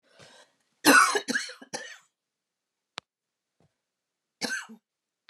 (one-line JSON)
{"cough_length": "5.3 s", "cough_amplitude": 17311, "cough_signal_mean_std_ratio": 0.26, "survey_phase": "beta (2021-08-13 to 2022-03-07)", "age": "65+", "gender": "Female", "wearing_mask": "No", "symptom_abdominal_pain": true, "symptom_onset": "11 days", "smoker_status": "Never smoked", "respiratory_condition_asthma": true, "respiratory_condition_other": true, "recruitment_source": "REACT", "submission_delay": "2 days", "covid_test_result": "Negative", "covid_test_method": "RT-qPCR", "influenza_a_test_result": "Negative", "influenza_b_test_result": "Negative"}